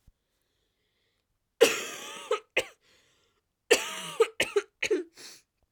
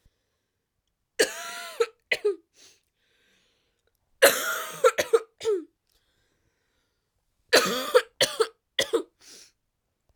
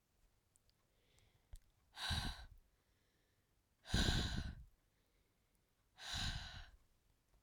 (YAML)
cough_length: 5.7 s
cough_amplitude: 17564
cough_signal_mean_std_ratio: 0.32
three_cough_length: 10.2 s
three_cough_amplitude: 21118
three_cough_signal_mean_std_ratio: 0.32
exhalation_length: 7.4 s
exhalation_amplitude: 2519
exhalation_signal_mean_std_ratio: 0.38
survey_phase: beta (2021-08-13 to 2022-03-07)
age: 18-44
gender: Female
wearing_mask: 'No'
symptom_cough_any: true
symptom_new_continuous_cough: true
symptom_runny_or_blocked_nose: true
smoker_status: Never smoked
respiratory_condition_asthma: false
respiratory_condition_other: false
recruitment_source: Test and Trace
submission_delay: 3 days
covid_test_result: Positive
covid_test_method: RT-qPCR
covid_ct_value: 30.4
covid_ct_gene: N gene